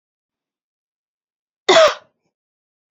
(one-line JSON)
{"cough_length": "2.9 s", "cough_amplitude": 28779, "cough_signal_mean_std_ratio": 0.23, "survey_phase": "beta (2021-08-13 to 2022-03-07)", "age": "18-44", "gender": "Female", "wearing_mask": "No", "symptom_none": true, "smoker_status": "Never smoked", "respiratory_condition_asthma": false, "respiratory_condition_other": false, "recruitment_source": "REACT", "submission_delay": "1 day", "covid_test_result": "Negative", "covid_test_method": "RT-qPCR", "influenza_a_test_result": "Negative", "influenza_b_test_result": "Negative"}